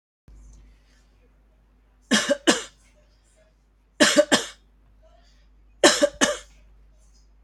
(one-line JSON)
{"three_cough_length": "7.4 s", "three_cough_amplitude": 29722, "three_cough_signal_mean_std_ratio": 0.3, "survey_phase": "beta (2021-08-13 to 2022-03-07)", "age": "65+", "gender": "Female", "wearing_mask": "No", "symptom_none": true, "smoker_status": "Ex-smoker", "respiratory_condition_asthma": false, "respiratory_condition_other": false, "recruitment_source": "REACT", "submission_delay": "1 day", "covid_test_result": "Negative", "covid_test_method": "RT-qPCR", "influenza_a_test_result": "Unknown/Void", "influenza_b_test_result": "Unknown/Void"}